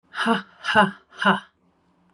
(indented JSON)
{
  "exhalation_length": "2.1 s",
  "exhalation_amplitude": 22826,
  "exhalation_signal_mean_std_ratio": 0.43,
  "survey_phase": "beta (2021-08-13 to 2022-03-07)",
  "age": "18-44",
  "gender": "Female",
  "wearing_mask": "No",
  "symptom_none": true,
  "smoker_status": "Never smoked",
  "respiratory_condition_asthma": false,
  "respiratory_condition_other": false,
  "recruitment_source": "REACT",
  "submission_delay": "1 day",
  "covid_test_result": "Negative",
  "covid_test_method": "RT-qPCR",
  "influenza_a_test_result": "Negative",
  "influenza_b_test_result": "Negative"
}